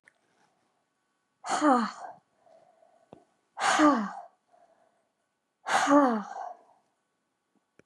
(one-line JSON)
{"exhalation_length": "7.9 s", "exhalation_amplitude": 10488, "exhalation_signal_mean_std_ratio": 0.36, "survey_phase": "beta (2021-08-13 to 2022-03-07)", "age": "45-64", "gender": "Female", "wearing_mask": "No", "symptom_none": true, "smoker_status": "Never smoked", "respiratory_condition_asthma": false, "respiratory_condition_other": false, "recruitment_source": "REACT", "submission_delay": "2 days", "covid_test_result": "Negative", "covid_test_method": "RT-qPCR", "influenza_a_test_result": "Negative", "influenza_b_test_result": "Negative"}